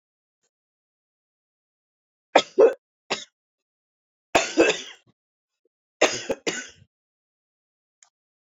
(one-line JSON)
{"three_cough_length": "8.5 s", "three_cough_amplitude": 26413, "three_cough_signal_mean_std_ratio": 0.24, "survey_phase": "beta (2021-08-13 to 2022-03-07)", "age": "45-64", "gender": "Female", "wearing_mask": "No", "symptom_cough_any": true, "symptom_new_continuous_cough": true, "symptom_runny_or_blocked_nose": true, "symptom_shortness_of_breath": true, "symptom_sore_throat": true, "symptom_fatigue": true, "symptom_headache": true, "smoker_status": "Ex-smoker", "respiratory_condition_asthma": false, "respiratory_condition_other": false, "recruitment_source": "Test and Trace", "submission_delay": "2 days", "covid_test_result": "Positive", "covid_test_method": "RT-qPCR", "covid_ct_value": 26.1, "covid_ct_gene": "ORF1ab gene", "covid_ct_mean": 26.5, "covid_viral_load": "2100 copies/ml", "covid_viral_load_category": "Minimal viral load (< 10K copies/ml)"}